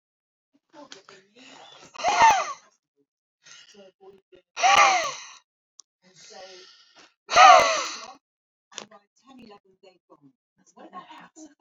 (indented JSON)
{
  "exhalation_length": "11.6 s",
  "exhalation_amplitude": 28328,
  "exhalation_signal_mean_std_ratio": 0.29,
  "survey_phase": "alpha (2021-03-01 to 2021-08-12)",
  "age": "45-64",
  "gender": "Male",
  "wearing_mask": "No",
  "symptom_none": true,
  "smoker_status": "Never smoked",
  "respiratory_condition_asthma": false,
  "respiratory_condition_other": false,
  "recruitment_source": "REACT",
  "submission_delay": "2 days",
  "covid_test_result": "Negative",
  "covid_test_method": "RT-qPCR"
}